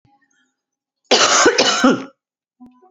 {"cough_length": "2.9 s", "cough_amplitude": 32767, "cough_signal_mean_std_ratio": 0.45, "survey_phase": "beta (2021-08-13 to 2022-03-07)", "age": "18-44", "gender": "Female", "wearing_mask": "No", "symptom_cough_any": true, "symptom_runny_or_blocked_nose": true, "symptom_sore_throat": true, "symptom_fatigue": true, "symptom_fever_high_temperature": true, "symptom_onset": "2 days", "smoker_status": "Never smoked", "respiratory_condition_asthma": false, "respiratory_condition_other": false, "recruitment_source": "Test and Trace", "submission_delay": "1 day", "covid_test_result": "Negative", "covid_test_method": "ePCR"}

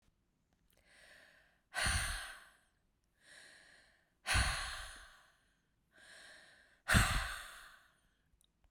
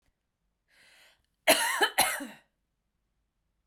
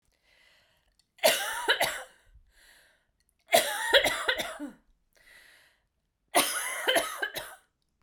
{"exhalation_length": "8.7 s", "exhalation_amplitude": 6561, "exhalation_signal_mean_std_ratio": 0.35, "cough_length": "3.7 s", "cough_amplitude": 14840, "cough_signal_mean_std_ratio": 0.31, "three_cough_length": "8.0 s", "three_cough_amplitude": 15991, "three_cough_signal_mean_std_ratio": 0.41, "survey_phase": "beta (2021-08-13 to 2022-03-07)", "age": "18-44", "gender": "Female", "wearing_mask": "No", "symptom_cough_any": true, "symptom_runny_or_blocked_nose": true, "symptom_shortness_of_breath": true, "symptom_sore_throat": true, "symptom_fatigue": true, "symptom_headache": true, "smoker_status": "Never smoked", "respiratory_condition_asthma": false, "respiratory_condition_other": false, "recruitment_source": "Test and Trace", "submission_delay": "2 days", "covid_test_result": "Positive", "covid_test_method": "RT-qPCR", "covid_ct_value": 25.1, "covid_ct_gene": "ORF1ab gene", "covid_ct_mean": 25.6, "covid_viral_load": "4000 copies/ml", "covid_viral_load_category": "Minimal viral load (< 10K copies/ml)"}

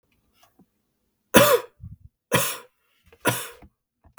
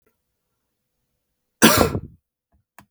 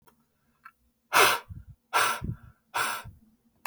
{"three_cough_length": "4.2 s", "three_cough_amplitude": 32768, "three_cough_signal_mean_std_ratio": 0.29, "cough_length": "2.9 s", "cough_amplitude": 32768, "cough_signal_mean_std_ratio": 0.25, "exhalation_length": "3.7 s", "exhalation_amplitude": 15629, "exhalation_signal_mean_std_ratio": 0.38, "survey_phase": "beta (2021-08-13 to 2022-03-07)", "age": "18-44", "gender": "Male", "wearing_mask": "No", "symptom_none": true, "smoker_status": "Ex-smoker", "respiratory_condition_asthma": false, "respiratory_condition_other": false, "recruitment_source": "REACT", "submission_delay": "11 days", "covid_test_result": "Negative", "covid_test_method": "RT-qPCR"}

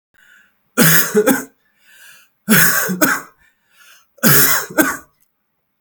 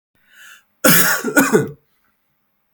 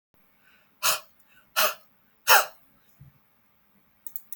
{"three_cough_length": "5.8 s", "three_cough_amplitude": 32768, "three_cough_signal_mean_std_ratio": 0.47, "cough_length": "2.7 s", "cough_amplitude": 32768, "cough_signal_mean_std_ratio": 0.42, "exhalation_length": "4.4 s", "exhalation_amplitude": 28118, "exhalation_signal_mean_std_ratio": 0.26, "survey_phase": "beta (2021-08-13 to 2022-03-07)", "age": "18-44", "gender": "Male", "wearing_mask": "No", "symptom_none": true, "smoker_status": "Never smoked", "respiratory_condition_asthma": false, "respiratory_condition_other": false, "recruitment_source": "REACT", "submission_delay": "2 days", "covid_test_result": "Negative", "covid_test_method": "RT-qPCR", "influenza_a_test_result": "Negative", "influenza_b_test_result": "Negative"}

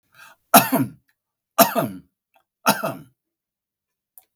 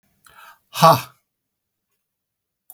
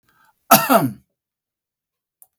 {"three_cough_length": "4.4 s", "three_cough_amplitude": 32768, "three_cough_signal_mean_std_ratio": 0.29, "exhalation_length": "2.7 s", "exhalation_amplitude": 32768, "exhalation_signal_mean_std_ratio": 0.22, "cough_length": "2.4 s", "cough_amplitude": 32768, "cough_signal_mean_std_ratio": 0.28, "survey_phase": "beta (2021-08-13 to 2022-03-07)", "age": "65+", "gender": "Male", "wearing_mask": "No", "symptom_none": true, "smoker_status": "Never smoked", "respiratory_condition_asthma": false, "respiratory_condition_other": false, "recruitment_source": "REACT", "submission_delay": "8 days", "covid_test_result": "Negative", "covid_test_method": "RT-qPCR", "influenza_a_test_result": "Negative", "influenza_b_test_result": "Negative"}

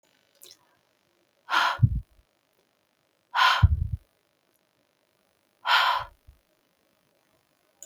{"exhalation_length": "7.9 s", "exhalation_amplitude": 14341, "exhalation_signal_mean_std_ratio": 0.31, "survey_phase": "beta (2021-08-13 to 2022-03-07)", "age": "65+", "gender": "Female", "wearing_mask": "No", "symptom_cough_any": true, "smoker_status": "Never smoked", "respiratory_condition_asthma": false, "respiratory_condition_other": false, "recruitment_source": "REACT", "submission_delay": "0 days", "covid_test_result": "Negative", "covid_test_method": "RT-qPCR", "influenza_a_test_result": "Negative", "influenza_b_test_result": "Negative"}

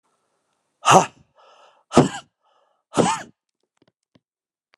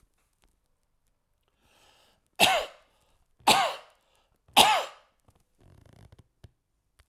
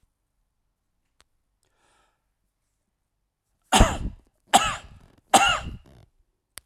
{"exhalation_length": "4.8 s", "exhalation_amplitude": 32767, "exhalation_signal_mean_std_ratio": 0.25, "three_cough_length": "7.1 s", "three_cough_amplitude": 23588, "three_cough_signal_mean_std_ratio": 0.26, "cough_length": "6.7 s", "cough_amplitude": 27146, "cough_signal_mean_std_ratio": 0.25, "survey_phase": "alpha (2021-03-01 to 2021-08-12)", "age": "65+", "gender": "Male", "wearing_mask": "No", "symptom_cough_any": true, "symptom_fatigue": true, "symptom_headache": true, "smoker_status": "Ex-smoker", "respiratory_condition_asthma": false, "respiratory_condition_other": false, "recruitment_source": "Test and Trace", "submission_delay": "1 day", "covid_test_result": "Positive", "covid_test_method": "RT-qPCR", "covid_ct_value": 13.0, "covid_ct_gene": "N gene", "covid_ct_mean": 14.4, "covid_viral_load": "20000000 copies/ml", "covid_viral_load_category": "High viral load (>1M copies/ml)"}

